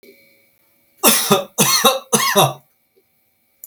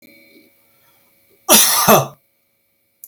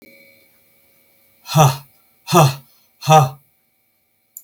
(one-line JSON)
{"three_cough_length": "3.7 s", "three_cough_amplitude": 32768, "three_cough_signal_mean_std_ratio": 0.45, "cough_length": "3.1 s", "cough_amplitude": 32768, "cough_signal_mean_std_ratio": 0.35, "exhalation_length": "4.4 s", "exhalation_amplitude": 32768, "exhalation_signal_mean_std_ratio": 0.33, "survey_phase": "beta (2021-08-13 to 2022-03-07)", "age": "45-64", "gender": "Male", "wearing_mask": "No", "symptom_none": true, "smoker_status": "Never smoked", "respiratory_condition_asthma": false, "respiratory_condition_other": false, "recruitment_source": "REACT", "submission_delay": "1 day", "covid_test_result": "Negative", "covid_test_method": "RT-qPCR", "influenza_a_test_result": "Negative", "influenza_b_test_result": "Negative"}